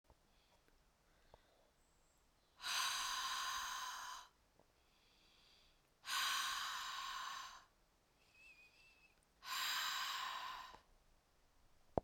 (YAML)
exhalation_length: 12.0 s
exhalation_amplitude: 3622
exhalation_signal_mean_std_ratio: 0.54
survey_phase: beta (2021-08-13 to 2022-03-07)
age: 45-64
gender: Female
wearing_mask: 'No'
symptom_none: true
smoker_status: Never smoked
respiratory_condition_asthma: false
respiratory_condition_other: false
recruitment_source: REACT
submission_delay: 2 days
covid_test_result: Negative
covid_test_method: RT-qPCR